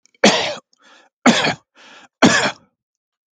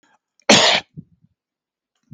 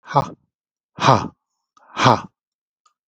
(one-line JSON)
{"three_cough_length": "3.3 s", "three_cough_amplitude": 32768, "three_cough_signal_mean_std_ratio": 0.39, "cough_length": "2.1 s", "cough_amplitude": 32768, "cough_signal_mean_std_ratio": 0.3, "exhalation_length": "3.1 s", "exhalation_amplitude": 32768, "exhalation_signal_mean_std_ratio": 0.31, "survey_phase": "beta (2021-08-13 to 2022-03-07)", "age": "45-64", "gender": "Male", "wearing_mask": "No", "symptom_none": true, "smoker_status": "Never smoked", "respiratory_condition_asthma": false, "respiratory_condition_other": false, "recruitment_source": "REACT", "submission_delay": "3 days", "covid_test_result": "Negative", "covid_test_method": "RT-qPCR", "influenza_a_test_result": "Negative", "influenza_b_test_result": "Negative"}